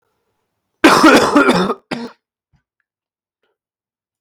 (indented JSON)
{
  "cough_length": "4.2 s",
  "cough_amplitude": 32768,
  "cough_signal_mean_std_ratio": 0.38,
  "survey_phase": "beta (2021-08-13 to 2022-03-07)",
  "age": "18-44",
  "gender": "Male",
  "wearing_mask": "No",
  "symptom_cough_any": true,
  "symptom_runny_or_blocked_nose": true,
  "symptom_fatigue": true,
  "symptom_headache": true,
  "smoker_status": "Never smoked",
  "respiratory_condition_asthma": false,
  "respiratory_condition_other": false,
  "recruitment_source": "Test and Trace",
  "submission_delay": "1 day",
  "covid_test_result": "Positive",
  "covid_test_method": "RT-qPCR",
  "covid_ct_value": 16.2,
  "covid_ct_gene": "N gene"
}